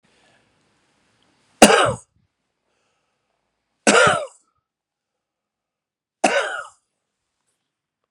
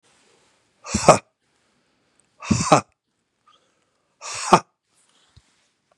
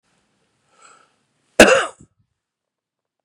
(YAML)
three_cough_length: 8.1 s
three_cough_amplitude: 32768
three_cough_signal_mean_std_ratio: 0.25
exhalation_length: 6.0 s
exhalation_amplitude: 32768
exhalation_signal_mean_std_ratio: 0.22
cough_length: 3.2 s
cough_amplitude: 32768
cough_signal_mean_std_ratio: 0.21
survey_phase: beta (2021-08-13 to 2022-03-07)
age: 45-64
gender: Male
wearing_mask: 'No'
symptom_none: true
symptom_onset: 4 days
smoker_status: Ex-smoker
respiratory_condition_asthma: false
respiratory_condition_other: false
recruitment_source: REACT
submission_delay: 1 day
covid_test_result: Negative
covid_test_method: RT-qPCR
influenza_a_test_result: Negative
influenza_b_test_result: Negative